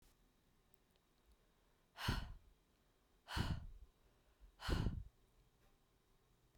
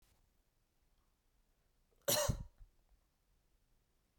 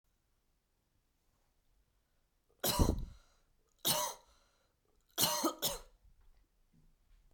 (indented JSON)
{
  "exhalation_length": "6.6 s",
  "exhalation_amplitude": 1590,
  "exhalation_signal_mean_std_ratio": 0.35,
  "cough_length": "4.2 s",
  "cough_amplitude": 3035,
  "cough_signal_mean_std_ratio": 0.24,
  "three_cough_length": "7.3 s",
  "three_cough_amplitude": 5943,
  "three_cough_signal_mean_std_ratio": 0.32,
  "survey_phase": "beta (2021-08-13 to 2022-03-07)",
  "age": "18-44",
  "gender": "Female",
  "wearing_mask": "No",
  "symptom_cough_any": true,
  "symptom_runny_or_blocked_nose": true,
  "symptom_sore_throat": true,
  "symptom_fatigue": true,
  "symptom_onset": "4 days",
  "smoker_status": "Ex-smoker",
  "respiratory_condition_asthma": false,
  "respiratory_condition_other": false,
  "recruitment_source": "Test and Trace",
  "submission_delay": "1 day",
  "covid_test_result": "Negative",
  "covid_test_method": "RT-qPCR"
}